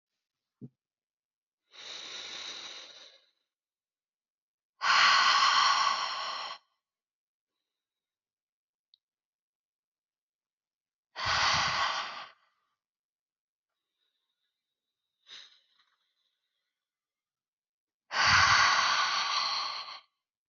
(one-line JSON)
{"exhalation_length": "20.5 s", "exhalation_amplitude": 9285, "exhalation_signal_mean_std_ratio": 0.37, "survey_phase": "alpha (2021-03-01 to 2021-08-12)", "age": "18-44", "gender": "Female", "wearing_mask": "No", "symptom_cough_any": true, "symptom_new_continuous_cough": true, "symptom_shortness_of_breath": true, "symptom_fatigue": true, "symptom_headache": true, "symptom_change_to_sense_of_smell_or_taste": true, "symptom_loss_of_taste": true, "symptom_onset": "2 days", "smoker_status": "Ex-smoker", "respiratory_condition_asthma": true, "respiratory_condition_other": false, "recruitment_source": "Test and Trace", "submission_delay": "2 days", "covid_test_result": "Positive", "covid_test_method": "RT-qPCR", "covid_ct_value": 16.2, "covid_ct_gene": "ORF1ab gene", "covid_ct_mean": 16.9, "covid_viral_load": "3000000 copies/ml", "covid_viral_load_category": "High viral load (>1M copies/ml)"}